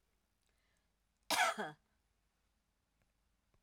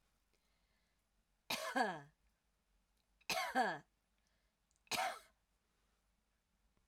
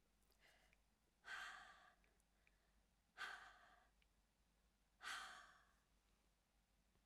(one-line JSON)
{"cough_length": "3.6 s", "cough_amplitude": 3687, "cough_signal_mean_std_ratio": 0.24, "three_cough_length": "6.9 s", "three_cough_amplitude": 1989, "three_cough_signal_mean_std_ratio": 0.33, "exhalation_length": "7.1 s", "exhalation_amplitude": 359, "exhalation_signal_mean_std_ratio": 0.43, "survey_phase": "alpha (2021-03-01 to 2021-08-12)", "age": "65+", "gender": "Female", "wearing_mask": "No", "symptom_none": true, "smoker_status": "Never smoked", "respiratory_condition_asthma": false, "respiratory_condition_other": false, "recruitment_source": "REACT", "submission_delay": "2 days", "covid_test_result": "Negative", "covid_test_method": "RT-qPCR"}